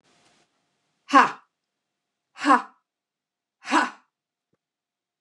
{"exhalation_length": "5.2 s", "exhalation_amplitude": 28616, "exhalation_signal_mean_std_ratio": 0.24, "survey_phase": "beta (2021-08-13 to 2022-03-07)", "age": "45-64", "gender": "Female", "wearing_mask": "No", "symptom_runny_or_blocked_nose": true, "symptom_loss_of_taste": true, "smoker_status": "Never smoked", "respiratory_condition_asthma": true, "respiratory_condition_other": false, "recruitment_source": "Test and Trace", "submission_delay": "1 day", "covid_test_result": "Positive", "covid_test_method": "RT-qPCR", "covid_ct_value": 17.7, "covid_ct_gene": "ORF1ab gene", "covid_ct_mean": 18.3, "covid_viral_load": "970000 copies/ml", "covid_viral_load_category": "Low viral load (10K-1M copies/ml)"}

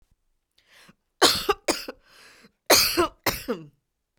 {"cough_length": "4.2 s", "cough_amplitude": 32767, "cough_signal_mean_std_ratio": 0.36, "survey_phase": "beta (2021-08-13 to 2022-03-07)", "age": "45-64", "gender": "Female", "wearing_mask": "Yes", "symptom_none": true, "smoker_status": "Never smoked", "respiratory_condition_asthma": true, "respiratory_condition_other": false, "recruitment_source": "REACT", "submission_delay": "8 days", "covid_test_result": "Negative", "covid_test_method": "RT-qPCR"}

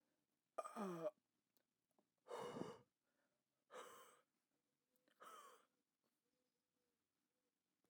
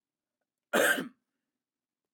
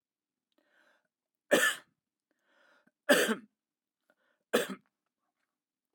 {"exhalation_length": "7.9 s", "exhalation_amplitude": 670, "exhalation_signal_mean_std_ratio": 0.33, "cough_length": "2.1 s", "cough_amplitude": 6860, "cough_signal_mean_std_ratio": 0.3, "three_cough_length": "5.9 s", "three_cough_amplitude": 11098, "three_cough_signal_mean_std_ratio": 0.25, "survey_phase": "beta (2021-08-13 to 2022-03-07)", "age": "45-64", "gender": "Male", "wearing_mask": "No", "symptom_none": true, "smoker_status": "Never smoked", "respiratory_condition_asthma": false, "respiratory_condition_other": false, "recruitment_source": "REACT", "submission_delay": "2 days", "covid_test_result": "Negative", "covid_test_method": "RT-qPCR", "influenza_a_test_result": "Negative", "influenza_b_test_result": "Negative"}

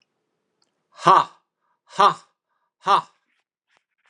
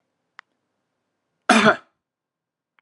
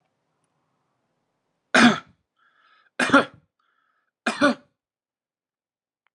{"exhalation_length": "4.1 s", "exhalation_amplitude": 32316, "exhalation_signal_mean_std_ratio": 0.26, "cough_length": "2.8 s", "cough_amplitude": 30991, "cough_signal_mean_std_ratio": 0.23, "three_cough_length": "6.1 s", "three_cough_amplitude": 27031, "three_cough_signal_mean_std_ratio": 0.24, "survey_phase": "beta (2021-08-13 to 2022-03-07)", "age": "45-64", "gender": "Male", "wearing_mask": "No", "symptom_none": true, "smoker_status": "Never smoked", "respiratory_condition_asthma": false, "respiratory_condition_other": false, "recruitment_source": "REACT", "submission_delay": "8 days", "covid_test_result": "Negative", "covid_test_method": "RT-qPCR"}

